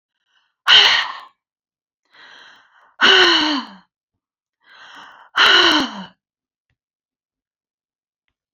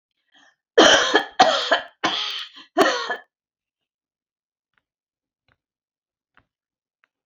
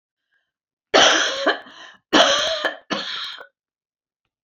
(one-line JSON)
{"exhalation_length": "8.5 s", "exhalation_amplitude": 32150, "exhalation_signal_mean_std_ratio": 0.35, "cough_length": "7.3 s", "cough_amplitude": 29495, "cough_signal_mean_std_ratio": 0.32, "three_cough_length": "4.4 s", "three_cough_amplitude": 29314, "three_cough_signal_mean_std_ratio": 0.44, "survey_phase": "beta (2021-08-13 to 2022-03-07)", "age": "65+", "gender": "Female", "wearing_mask": "No", "symptom_none": true, "smoker_status": "Never smoked", "respiratory_condition_asthma": false, "respiratory_condition_other": false, "recruitment_source": "REACT", "submission_delay": "1 day", "covid_test_result": "Negative", "covid_test_method": "RT-qPCR"}